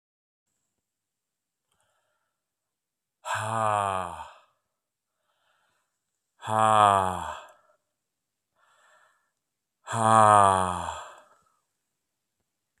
{"exhalation_length": "12.8 s", "exhalation_amplitude": 21142, "exhalation_signal_mean_std_ratio": 0.28, "survey_phase": "beta (2021-08-13 to 2022-03-07)", "age": "45-64", "gender": "Male", "wearing_mask": "No", "symptom_cough_any": true, "symptom_sore_throat": true, "symptom_fatigue": true, "symptom_fever_high_temperature": true, "symptom_headache": true, "symptom_onset": "4 days", "smoker_status": "Never smoked", "respiratory_condition_asthma": false, "respiratory_condition_other": false, "recruitment_source": "Test and Trace", "submission_delay": "1 day", "covid_test_result": "Positive", "covid_test_method": "RT-qPCR", "covid_ct_value": 23.8, "covid_ct_gene": "ORF1ab gene", "covid_ct_mean": 24.1, "covid_viral_load": "13000 copies/ml", "covid_viral_load_category": "Low viral load (10K-1M copies/ml)"}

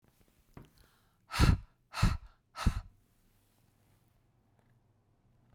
{"exhalation_length": "5.5 s", "exhalation_amplitude": 7154, "exhalation_signal_mean_std_ratio": 0.26, "survey_phase": "beta (2021-08-13 to 2022-03-07)", "age": "45-64", "gender": "Female", "wearing_mask": "No", "symptom_none": true, "smoker_status": "Never smoked", "respiratory_condition_asthma": false, "respiratory_condition_other": false, "recruitment_source": "REACT", "submission_delay": "1 day", "covid_test_result": "Negative", "covid_test_method": "RT-qPCR"}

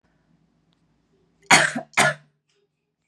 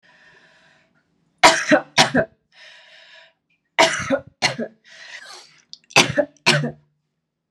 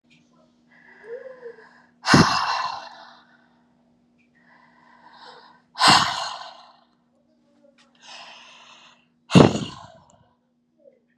{"cough_length": "3.1 s", "cough_amplitude": 32768, "cough_signal_mean_std_ratio": 0.27, "three_cough_length": "7.5 s", "three_cough_amplitude": 32767, "three_cough_signal_mean_std_ratio": 0.34, "exhalation_length": "11.2 s", "exhalation_amplitude": 32767, "exhalation_signal_mean_std_ratio": 0.27, "survey_phase": "beta (2021-08-13 to 2022-03-07)", "age": "18-44", "gender": "Female", "wearing_mask": "No", "symptom_cough_any": true, "symptom_runny_or_blocked_nose": true, "symptom_fatigue": true, "symptom_fever_high_temperature": true, "symptom_headache": true, "symptom_other": true, "symptom_onset": "2 days", "smoker_status": "Ex-smoker", "respiratory_condition_asthma": false, "respiratory_condition_other": false, "recruitment_source": "Test and Trace", "submission_delay": "2 days", "covid_test_result": "Positive", "covid_test_method": "RT-qPCR", "covid_ct_value": 18.6, "covid_ct_gene": "ORF1ab gene", "covid_ct_mean": 19.0, "covid_viral_load": "590000 copies/ml", "covid_viral_load_category": "Low viral load (10K-1M copies/ml)"}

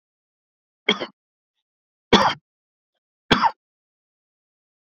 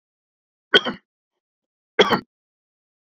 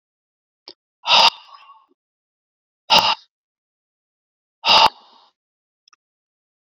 {"three_cough_length": "4.9 s", "three_cough_amplitude": 30914, "three_cough_signal_mean_std_ratio": 0.23, "cough_length": "3.2 s", "cough_amplitude": 28379, "cough_signal_mean_std_ratio": 0.22, "exhalation_length": "6.7 s", "exhalation_amplitude": 32314, "exhalation_signal_mean_std_ratio": 0.26, "survey_phase": "beta (2021-08-13 to 2022-03-07)", "age": "45-64", "gender": "Male", "wearing_mask": "No", "symptom_none": true, "smoker_status": "Never smoked", "respiratory_condition_asthma": false, "respiratory_condition_other": false, "recruitment_source": "REACT", "submission_delay": "1 day", "covid_test_result": "Negative", "covid_test_method": "RT-qPCR", "influenza_a_test_result": "Negative", "influenza_b_test_result": "Negative"}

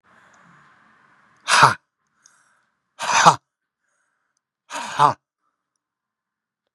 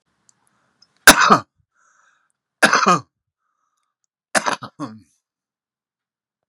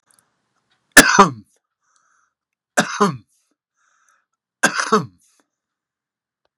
{"exhalation_length": "6.7 s", "exhalation_amplitude": 32768, "exhalation_signal_mean_std_ratio": 0.25, "cough_length": "6.5 s", "cough_amplitude": 32768, "cough_signal_mean_std_ratio": 0.25, "three_cough_length": "6.6 s", "three_cough_amplitude": 32768, "three_cough_signal_mean_std_ratio": 0.25, "survey_phase": "beta (2021-08-13 to 2022-03-07)", "age": "65+", "gender": "Male", "wearing_mask": "No", "symptom_cough_any": true, "symptom_runny_or_blocked_nose": true, "symptom_onset": "11 days", "smoker_status": "Current smoker (11 or more cigarettes per day)", "respiratory_condition_asthma": false, "respiratory_condition_other": false, "recruitment_source": "REACT", "submission_delay": "1 day", "covid_test_result": "Negative", "covid_test_method": "RT-qPCR", "influenza_a_test_result": "Negative", "influenza_b_test_result": "Negative"}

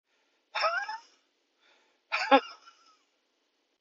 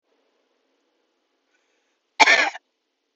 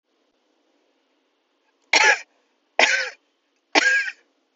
{"exhalation_length": "3.8 s", "exhalation_amplitude": 14344, "exhalation_signal_mean_std_ratio": 0.28, "cough_length": "3.2 s", "cough_amplitude": 32767, "cough_signal_mean_std_ratio": 0.23, "three_cough_length": "4.6 s", "three_cough_amplitude": 30183, "three_cough_signal_mean_std_ratio": 0.34, "survey_phase": "beta (2021-08-13 to 2022-03-07)", "age": "45-64", "gender": "Female", "wearing_mask": "No", "symptom_runny_or_blocked_nose": true, "symptom_shortness_of_breath": true, "symptom_sore_throat": true, "symptom_abdominal_pain": true, "symptom_fatigue": true, "symptom_fever_high_temperature": true, "symptom_change_to_sense_of_smell_or_taste": true, "symptom_loss_of_taste": true, "symptom_onset": "2 days", "smoker_status": "Ex-smoker", "respiratory_condition_asthma": false, "respiratory_condition_other": false, "recruitment_source": "Test and Trace", "submission_delay": "1 day", "covid_test_result": "Negative", "covid_test_method": "RT-qPCR"}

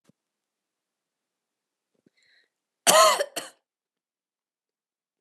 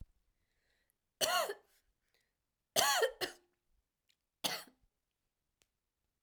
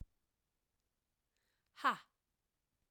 {"cough_length": "5.2 s", "cough_amplitude": 27786, "cough_signal_mean_std_ratio": 0.21, "three_cough_length": "6.2 s", "three_cough_amplitude": 7438, "three_cough_signal_mean_std_ratio": 0.3, "exhalation_length": "2.9 s", "exhalation_amplitude": 2854, "exhalation_signal_mean_std_ratio": 0.17, "survey_phase": "alpha (2021-03-01 to 2021-08-12)", "age": "18-44", "gender": "Female", "wearing_mask": "No", "symptom_cough_any": true, "symptom_shortness_of_breath": true, "symptom_diarrhoea": true, "symptom_headache": true, "symptom_onset": "2 days", "smoker_status": "Never smoked", "respiratory_condition_asthma": true, "respiratory_condition_other": false, "recruitment_source": "REACT", "submission_delay": "1 day", "covid_test_result": "Negative", "covid_test_method": "RT-qPCR"}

